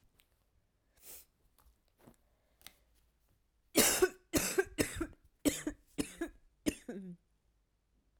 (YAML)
cough_length: 8.2 s
cough_amplitude: 7498
cough_signal_mean_std_ratio: 0.31
survey_phase: beta (2021-08-13 to 2022-03-07)
age: 18-44
gender: Female
wearing_mask: 'No'
symptom_cough_any: true
symptom_new_continuous_cough: true
symptom_runny_or_blocked_nose: true
symptom_change_to_sense_of_smell_or_taste: true
symptom_loss_of_taste: true
symptom_onset: 2 days
smoker_status: Never smoked
respiratory_condition_asthma: false
respiratory_condition_other: false
recruitment_source: Test and Trace
submission_delay: 1 day
covid_test_result: Positive
covid_test_method: RT-qPCR